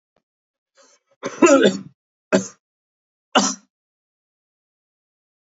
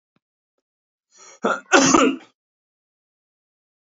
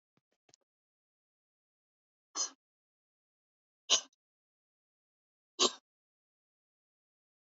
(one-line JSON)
{"three_cough_length": "5.5 s", "three_cough_amplitude": 29590, "three_cough_signal_mean_std_ratio": 0.27, "cough_length": "3.8 s", "cough_amplitude": 28646, "cough_signal_mean_std_ratio": 0.3, "exhalation_length": "7.5 s", "exhalation_amplitude": 7343, "exhalation_signal_mean_std_ratio": 0.15, "survey_phase": "beta (2021-08-13 to 2022-03-07)", "age": "45-64", "gender": "Male", "wearing_mask": "No", "symptom_cough_any": true, "smoker_status": "Ex-smoker", "respiratory_condition_asthma": false, "respiratory_condition_other": false, "recruitment_source": "Test and Trace", "submission_delay": "29 days", "covid_test_result": "Negative", "covid_test_method": "LFT"}